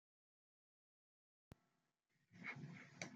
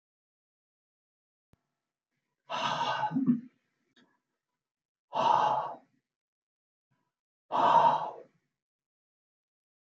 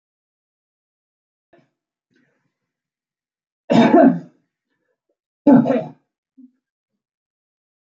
{"cough_length": "3.2 s", "cough_amplitude": 1105, "cough_signal_mean_std_ratio": 0.37, "exhalation_length": "9.9 s", "exhalation_amplitude": 8620, "exhalation_signal_mean_std_ratio": 0.35, "three_cough_length": "7.9 s", "three_cough_amplitude": 28514, "three_cough_signal_mean_std_ratio": 0.25, "survey_phase": "alpha (2021-03-01 to 2021-08-12)", "age": "65+", "gender": "Female", "wearing_mask": "No", "symptom_none": true, "smoker_status": "Never smoked", "respiratory_condition_asthma": false, "respiratory_condition_other": false, "recruitment_source": "REACT", "submission_delay": "2 days", "covid_test_result": "Negative", "covid_test_method": "RT-qPCR"}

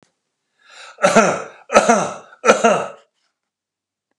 {"three_cough_length": "4.2 s", "three_cough_amplitude": 32768, "three_cough_signal_mean_std_ratio": 0.4, "survey_phase": "beta (2021-08-13 to 2022-03-07)", "age": "65+", "gender": "Male", "wearing_mask": "No", "symptom_none": true, "smoker_status": "Ex-smoker", "respiratory_condition_asthma": false, "respiratory_condition_other": false, "recruitment_source": "REACT", "submission_delay": "0 days", "covid_test_result": "Negative", "covid_test_method": "RT-qPCR"}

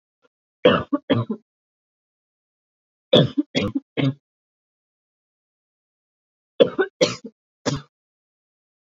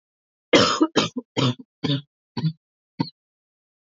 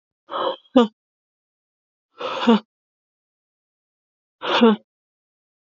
{"three_cough_length": "9.0 s", "three_cough_amplitude": 32767, "three_cough_signal_mean_std_ratio": 0.28, "cough_length": "3.9 s", "cough_amplitude": 25955, "cough_signal_mean_std_ratio": 0.38, "exhalation_length": "5.7 s", "exhalation_amplitude": 26888, "exhalation_signal_mean_std_ratio": 0.28, "survey_phase": "beta (2021-08-13 to 2022-03-07)", "age": "18-44", "gender": "Female", "wearing_mask": "No", "symptom_cough_any": true, "symptom_runny_or_blocked_nose": true, "smoker_status": "Never smoked", "respiratory_condition_asthma": false, "respiratory_condition_other": false, "recruitment_source": "Test and Trace", "submission_delay": "1 day", "covid_test_result": "Positive", "covid_test_method": "RT-qPCR", "covid_ct_value": 21.1, "covid_ct_gene": "N gene"}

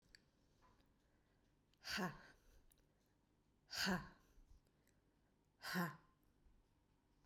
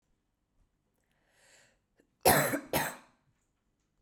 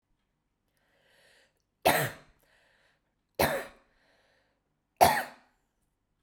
{"exhalation_length": "7.3 s", "exhalation_amplitude": 1097, "exhalation_signal_mean_std_ratio": 0.33, "cough_length": "4.0 s", "cough_amplitude": 11934, "cough_signal_mean_std_ratio": 0.27, "three_cough_length": "6.2 s", "three_cough_amplitude": 18432, "three_cough_signal_mean_std_ratio": 0.25, "survey_phase": "beta (2021-08-13 to 2022-03-07)", "age": "18-44", "gender": "Female", "wearing_mask": "No", "symptom_runny_or_blocked_nose": true, "smoker_status": "Current smoker (1 to 10 cigarettes per day)", "respiratory_condition_asthma": false, "respiratory_condition_other": false, "recruitment_source": "REACT", "submission_delay": "1 day", "covid_test_result": "Negative", "covid_test_method": "RT-qPCR", "influenza_a_test_result": "Negative", "influenza_b_test_result": "Negative"}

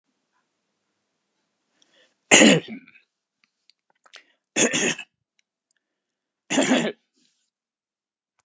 {"three_cough_length": "8.4 s", "three_cough_amplitude": 32767, "three_cough_signal_mean_std_ratio": 0.26, "survey_phase": "alpha (2021-03-01 to 2021-08-12)", "age": "65+", "gender": "Male", "wearing_mask": "No", "symptom_none": true, "smoker_status": "Never smoked", "respiratory_condition_asthma": false, "respiratory_condition_other": true, "recruitment_source": "Test and Trace", "submission_delay": "2 days", "covid_test_result": "Positive", "covid_test_method": "RT-qPCR", "covid_ct_value": 34.1, "covid_ct_gene": "ORF1ab gene"}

